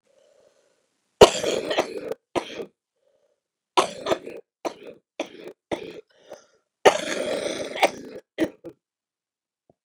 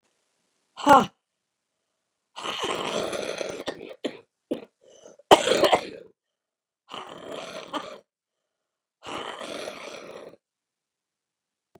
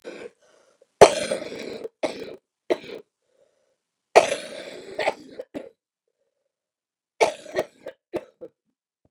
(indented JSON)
{
  "cough_length": "9.8 s",
  "cough_amplitude": 32768,
  "cough_signal_mean_std_ratio": 0.29,
  "exhalation_length": "11.8 s",
  "exhalation_amplitude": 32724,
  "exhalation_signal_mean_std_ratio": 0.28,
  "three_cough_length": "9.1 s",
  "three_cough_amplitude": 32768,
  "three_cough_signal_mean_std_ratio": 0.24,
  "survey_phase": "beta (2021-08-13 to 2022-03-07)",
  "age": "65+",
  "gender": "Female",
  "wearing_mask": "No",
  "symptom_cough_any": true,
  "symptom_runny_or_blocked_nose": true,
  "symptom_shortness_of_breath": true,
  "symptom_sore_throat": true,
  "symptom_fatigue": true,
  "symptom_headache": true,
  "symptom_onset": "12 days",
  "smoker_status": "Ex-smoker",
  "respiratory_condition_asthma": false,
  "respiratory_condition_other": true,
  "recruitment_source": "REACT",
  "submission_delay": "1 day",
  "covid_test_result": "Negative",
  "covid_test_method": "RT-qPCR",
  "influenza_a_test_result": "Negative",
  "influenza_b_test_result": "Negative"
}